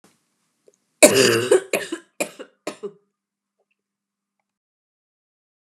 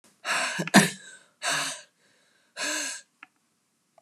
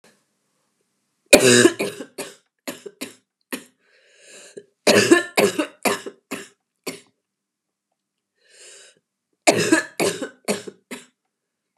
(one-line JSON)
{"cough_length": "5.6 s", "cough_amplitude": 32768, "cough_signal_mean_std_ratio": 0.26, "exhalation_length": "4.0 s", "exhalation_amplitude": 28509, "exhalation_signal_mean_std_ratio": 0.37, "three_cough_length": "11.8 s", "three_cough_amplitude": 32768, "three_cough_signal_mean_std_ratio": 0.31, "survey_phase": "beta (2021-08-13 to 2022-03-07)", "age": "45-64", "gender": "Female", "wearing_mask": "No", "symptom_cough_any": true, "symptom_runny_or_blocked_nose": true, "symptom_shortness_of_breath": true, "symptom_sore_throat": true, "symptom_fatigue": true, "symptom_headache": true, "symptom_other": true, "symptom_onset": "4 days", "smoker_status": "Never smoked", "respiratory_condition_asthma": false, "respiratory_condition_other": false, "recruitment_source": "Test and Trace", "submission_delay": "1 day", "covid_test_result": "Negative", "covid_test_method": "ePCR"}